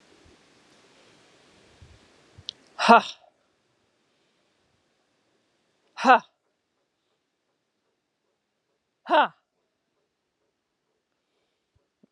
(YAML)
exhalation_length: 12.1 s
exhalation_amplitude: 28991
exhalation_signal_mean_std_ratio: 0.16
survey_phase: beta (2021-08-13 to 2022-03-07)
age: 45-64
gender: Female
wearing_mask: 'No'
symptom_runny_or_blocked_nose: true
symptom_shortness_of_breath: true
symptom_sore_throat: true
symptom_fatigue: true
symptom_change_to_sense_of_smell_or_taste: true
smoker_status: Never smoked
respiratory_condition_asthma: false
respiratory_condition_other: false
recruitment_source: Test and Trace
submission_delay: 2 days
covid_test_result: Positive
covid_test_method: RT-qPCR
covid_ct_value: 19.9
covid_ct_gene: S gene
covid_ct_mean: 20.9
covid_viral_load: 140000 copies/ml
covid_viral_load_category: Low viral load (10K-1M copies/ml)